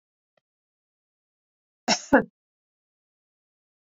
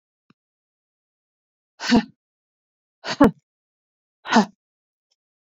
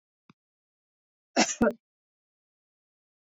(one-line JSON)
{"cough_length": "3.9 s", "cough_amplitude": 15227, "cough_signal_mean_std_ratio": 0.17, "exhalation_length": "5.5 s", "exhalation_amplitude": 27135, "exhalation_signal_mean_std_ratio": 0.22, "three_cough_length": "3.2 s", "three_cough_amplitude": 10836, "three_cough_signal_mean_std_ratio": 0.22, "survey_phase": "beta (2021-08-13 to 2022-03-07)", "age": "65+", "gender": "Female", "wearing_mask": "No", "symptom_none": true, "symptom_onset": "13 days", "smoker_status": "Never smoked", "respiratory_condition_asthma": false, "respiratory_condition_other": false, "recruitment_source": "REACT", "submission_delay": "1 day", "covid_test_result": "Negative", "covid_test_method": "RT-qPCR", "influenza_a_test_result": "Negative", "influenza_b_test_result": "Negative"}